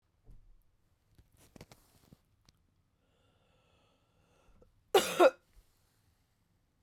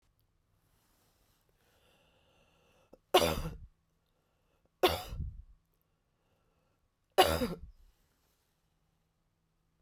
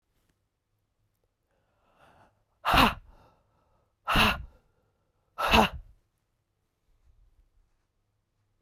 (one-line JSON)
{"cough_length": "6.8 s", "cough_amplitude": 8330, "cough_signal_mean_std_ratio": 0.17, "three_cough_length": "9.8 s", "three_cough_amplitude": 9928, "three_cough_signal_mean_std_ratio": 0.23, "exhalation_length": "8.6 s", "exhalation_amplitude": 15443, "exhalation_signal_mean_std_ratio": 0.25, "survey_phase": "beta (2021-08-13 to 2022-03-07)", "age": "45-64", "gender": "Female", "wearing_mask": "No", "symptom_cough_any": true, "symptom_runny_or_blocked_nose": true, "symptom_shortness_of_breath": true, "symptom_sore_throat": true, "symptom_onset": "6 days", "smoker_status": "Never smoked", "respiratory_condition_asthma": false, "respiratory_condition_other": false, "recruitment_source": "Test and Trace", "submission_delay": "3 days", "covid_test_result": "Positive", "covid_test_method": "RT-qPCR", "covid_ct_value": 18.6, "covid_ct_gene": "ORF1ab gene", "covid_ct_mean": 19.1, "covid_viral_load": "540000 copies/ml", "covid_viral_load_category": "Low viral load (10K-1M copies/ml)"}